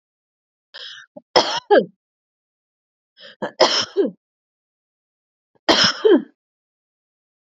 {"three_cough_length": "7.5 s", "three_cough_amplitude": 31772, "three_cough_signal_mean_std_ratio": 0.31, "survey_phase": "beta (2021-08-13 to 2022-03-07)", "age": "45-64", "gender": "Female", "wearing_mask": "No", "symptom_none": true, "smoker_status": "Never smoked", "respiratory_condition_asthma": false, "respiratory_condition_other": false, "recruitment_source": "Test and Trace", "submission_delay": "0 days", "covid_test_result": "Negative", "covid_test_method": "LFT"}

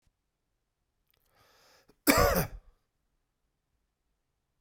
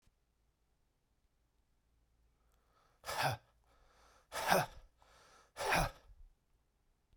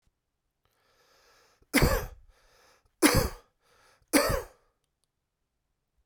{"cough_length": "4.6 s", "cough_amplitude": 16785, "cough_signal_mean_std_ratio": 0.23, "exhalation_length": "7.2 s", "exhalation_amplitude": 7457, "exhalation_signal_mean_std_ratio": 0.3, "three_cough_length": "6.1 s", "three_cough_amplitude": 15623, "three_cough_signal_mean_std_ratio": 0.29, "survey_phase": "beta (2021-08-13 to 2022-03-07)", "age": "18-44", "gender": "Male", "wearing_mask": "No", "symptom_cough_any": true, "symptom_runny_or_blocked_nose": true, "symptom_fatigue": true, "symptom_headache": true, "smoker_status": "Ex-smoker", "respiratory_condition_asthma": false, "respiratory_condition_other": false, "recruitment_source": "Test and Trace", "submission_delay": "2 days", "covid_test_result": "Positive", "covid_test_method": "RT-qPCR", "covid_ct_value": 17.5, "covid_ct_gene": "ORF1ab gene"}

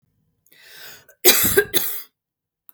{"cough_length": "2.7 s", "cough_amplitude": 32768, "cough_signal_mean_std_ratio": 0.36, "survey_phase": "beta (2021-08-13 to 2022-03-07)", "age": "45-64", "gender": "Female", "wearing_mask": "No", "symptom_none": true, "smoker_status": "Ex-smoker", "respiratory_condition_asthma": false, "respiratory_condition_other": false, "recruitment_source": "REACT", "submission_delay": "1 day", "covid_test_result": "Negative", "covid_test_method": "RT-qPCR", "influenza_a_test_result": "Negative", "influenza_b_test_result": "Negative"}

